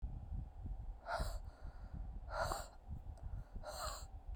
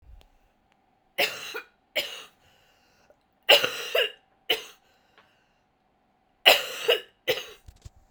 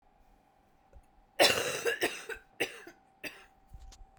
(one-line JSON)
{"exhalation_length": "4.4 s", "exhalation_amplitude": 1959, "exhalation_signal_mean_std_ratio": 0.96, "three_cough_length": "8.1 s", "three_cough_amplitude": 29989, "three_cough_signal_mean_std_ratio": 0.29, "cough_length": "4.2 s", "cough_amplitude": 11153, "cough_signal_mean_std_ratio": 0.36, "survey_phase": "beta (2021-08-13 to 2022-03-07)", "age": "18-44", "gender": "Female", "wearing_mask": "No", "symptom_cough_any": true, "symptom_runny_or_blocked_nose": true, "symptom_shortness_of_breath": true, "symptom_sore_throat": true, "symptom_fatigue": true, "symptom_fever_high_temperature": true, "symptom_headache": true, "symptom_change_to_sense_of_smell_or_taste": true, "symptom_loss_of_taste": true, "symptom_onset": "3 days", "smoker_status": "Current smoker (1 to 10 cigarettes per day)", "respiratory_condition_asthma": false, "respiratory_condition_other": false, "recruitment_source": "Test and Trace", "submission_delay": "2 days", "covid_test_result": "Positive", "covid_test_method": "RT-qPCR", "covid_ct_value": 18.6, "covid_ct_gene": "ORF1ab gene", "covid_ct_mean": 19.1, "covid_viral_load": "560000 copies/ml", "covid_viral_load_category": "Low viral load (10K-1M copies/ml)"}